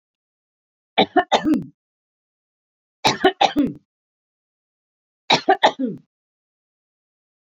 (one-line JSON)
{"three_cough_length": "7.4 s", "three_cough_amplitude": 28168, "three_cough_signal_mean_std_ratio": 0.31, "survey_phase": "beta (2021-08-13 to 2022-03-07)", "age": "45-64", "gender": "Female", "wearing_mask": "No", "symptom_none": true, "smoker_status": "Never smoked", "respiratory_condition_asthma": false, "respiratory_condition_other": false, "recruitment_source": "REACT", "submission_delay": "3 days", "covid_test_result": "Negative", "covid_test_method": "RT-qPCR", "influenza_a_test_result": "Negative", "influenza_b_test_result": "Negative"}